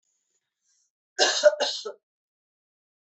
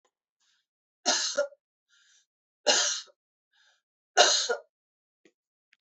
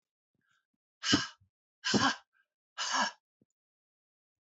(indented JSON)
{
  "cough_length": "3.1 s",
  "cough_amplitude": 17587,
  "cough_signal_mean_std_ratio": 0.29,
  "three_cough_length": "5.8 s",
  "three_cough_amplitude": 18380,
  "three_cough_signal_mean_std_ratio": 0.32,
  "exhalation_length": "4.5 s",
  "exhalation_amplitude": 7708,
  "exhalation_signal_mean_std_ratio": 0.33,
  "survey_phase": "beta (2021-08-13 to 2022-03-07)",
  "age": "65+",
  "gender": "Female",
  "wearing_mask": "No",
  "symptom_runny_or_blocked_nose": true,
  "symptom_change_to_sense_of_smell_or_taste": true,
  "symptom_other": true,
  "smoker_status": "Never smoked",
  "respiratory_condition_asthma": false,
  "respiratory_condition_other": false,
  "recruitment_source": "Test and Trace",
  "submission_delay": "2 days",
  "covid_test_result": "Positive",
  "covid_test_method": "RT-qPCR",
  "covid_ct_value": 28.9,
  "covid_ct_gene": "ORF1ab gene",
  "covid_ct_mean": 29.3,
  "covid_viral_load": "240 copies/ml",
  "covid_viral_load_category": "Minimal viral load (< 10K copies/ml)"
}